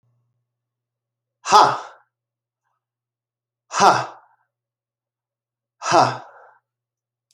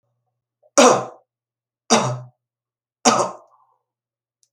{"exhalation_length": "7.3 s", "exhalation_amplitude": 30783, "exhalation_signal_mean_std_ratio": 0.26, "three_cough_length": "4.5 s", "three_cough_amplitude": 32768, "three_cough_signal_mean_std_ratio": 0.3, "survey_phase": "alpha (2021-03-01 to 2021-08-12)", "age": "45-64", "gender": "Male", "wearing_mask": "No", "symptom_cough_any": true, "symptom_new_continuous_cough": true, "symptom_fatigue": true, "symptom_fever_high_temperature": true, "symptom_headache": true, "symptom_change_to_sense_of_smell_or_taste": true, "symptom_onset": "3 days", "smoker_status": "Never smoked", "respiratory_condition_asthma": false, "respiratory_condition_other": false, "recruitment_source": "Test and Trace", "submission_delay": "2 days", "covid_test_result": "Positive", "covid_test_method": "RT-qPCR"}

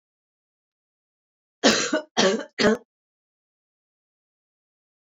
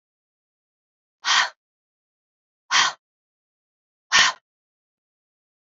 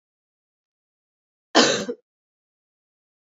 {"three_cough_length": "5.1 s", "three_cough_amplitude": 23569, "three_cough_signal_mean_std_ratio": 0.29, "exhalation_length": "5.7 s", "exhalation_amplitude": 25087, "exhalation_signal_mean_std_ratio": 0.25, "cough_length": "3.2 s", "cough_amplitude": 27407, "cough_signal_mean_std_ratio": 0.22, "survey_phase": "beta (2021-08-13 to 2022-03-07)", "age": "45-64", "gender": "Female", "wearing_mask": "No", "symptom_new_continuous_cough": true, "symptom_runny_or_blocked_nose": true, "symptom_fatigue": true, "symptom_fever_high_temperature": true, "symptom_headache": true, "symptom_change_to_sense_of_smell_or_taste": true, "symptom_loss_of_taste": true, "symptom_onset": "4 days", "smoker_status": "Never smoked", "respiratory_condition_asthma": false, "respiratory_condition_other": false, "recruitment_source": "Test and Trace", "submission_delay": "2 days", "covid_test_result": "Positive", "covid_test_method": "RT-qPCR", "covid_ct_value": 26.0, "covid_ct_gene": "ORF1ab gene", "covid_ct_mean": 26.5, "covid_viral_load": "2000 copies/ml", "covid_viral_load_category": "Minimal viral load (< 10K copies/ml)"}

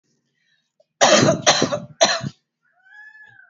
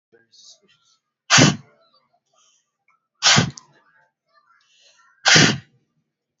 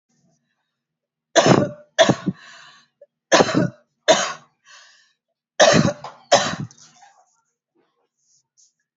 {"cough_length": "3.5 s", "cough_amplitude": 32768, "cough_signal_mean_std_ratio": 0.4, "exhalation_length": "6.4 s", "exhalation_amplitude": 32768, "exhalation_signal_mean_std_ratio": 0.28, "three_cough_length": "9.0 s", "three_cough_amplitude": 30991, "three_cough_signal_mean_std_ratio": 0.33, "survey_phase": "beta (2021-08-13 to 2022-03-07)", "age": "18-44", "gender": "Female", "wearing_mask": "No", "symptom_none": true, "smoker_status": "Never smoked", "respiratory_condition_asthma": false, "respiratory_condition_other": false, "recruitment_source": "REACT", "submission_delay": "2 days", "covid_test_result": "Negative", "covid_test_method": "RT-qPCR", "influenza_a_test_result": "Negative", "influenza_b_test_result": "Negative"}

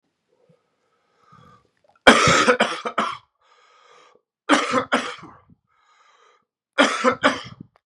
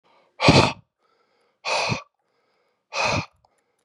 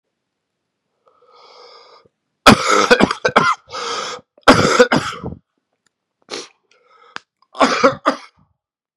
{"three_cough_length": "7.9 s", "three_cough_amplitude": 32768, "three_cough_signal_mean_std_ratio": 0.35, "exhalation_length": "3.8 s", "exhalation_amplitude": 27982, "exhalation_signal_mean_std_ratio": 0.35, "cough_length": "9.0 s", "cough_amplitude": 32768, "cough_signal_mean_std_ratio": 0.36, "survey_phase": "beta (2021-08-13 to 2022-03-07)", "age": "45-64", "gender": "Male", "wearing_mask": "No", "symptom_cough_any": true, "symptom_new_continuous_cough": true, "symptom_runny_or_blocked_nose": true, "symptom_shortness_of_breath": true, "symptom_sore_throat": true, "symptom_fatigue": true, "symptom_fever_high_temperature": true, "symptom_headache": true, "symptom_change_to_sense_of_smell_or_taste": true, "symptom_onset": "3 days", "smoker_status": "Ex-smoker", "respiratory_condition_asthma": false, "respiratory_condition_other": false, "recruitment_source": "Test and Trace", "submission_delay": "2 days", "covid_test_result": "Positive", "covid_test_method": "RT-qPCR", "covid_ct_value": 20.8, "covid_ct_gene": "N gene"}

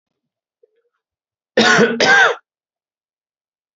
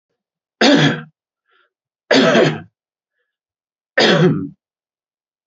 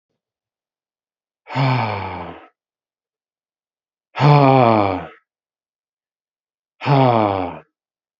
{"cough_length": "3.8 s", "cough_amplitude": 31940, "cough_signal_mean_std_ratio": 0.37, "three_cough_length": "5.5 s", "three_cough_amplitude": 29419, "three_cough_signal_mean_std_ratio": 0.41, "exhalation_length": "8.2 s", "exhalation_amplitude": 29241, "exhalation_signal_mean_std_ratio": 0.39, "survey_phase": "beta (2021-08-13 to 2022-03-07)", "age": "18-44", "gender": "Male", "wearing_mask": "Yes", "symptom_cough_any": true, "symptom_runny_or_blocked_nose": true, "symptom_fatigue": true, "symptom_headache": true, "smoker_status": "Ex-smoker", "respiratory_condition_asthma": false, "respiratory_condition_other": false, "recruitment_source": "Test and Trace", "submission_delay": "2 days", "covid_test_result": "Positive", "covid_test_method": "RT-qPCR"}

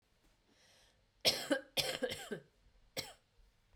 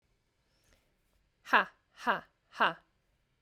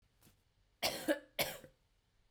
{"three_cough_length": "3.8 s", "three_cough_amplitude": 5885, "three_cough_signal_mean_std_ratio": 0.36, "exhalation_length": "3.4 s", "exhalation_amplitude": 11476, "exhalation_signal_mean_std_ratio": 0.24, "cough_length": "2.3 s", "cough_amplitude": 3652, "cough_signal_mean_std_ratio": 0.35, "survey_phase": "beta (2021-08-13 to 2022-03-07)", "age": "18-44", "gender": "Female", "wearing_mask": "No", "symptom_cough_any": true, "symptom_runny_or_blocked_nose": true, "symptom_fatigue": true, "symptom_fever_high_temperature": true, "smoker_status": "Ex-smoker", "respiratory_condition_asthma": false, "respiratory_condition_other": false, "recruitment_source": "Test and Trace", "submission_delay": "1 day", "covid_test_result": "Positive", "covid_test_method": "ePCR"}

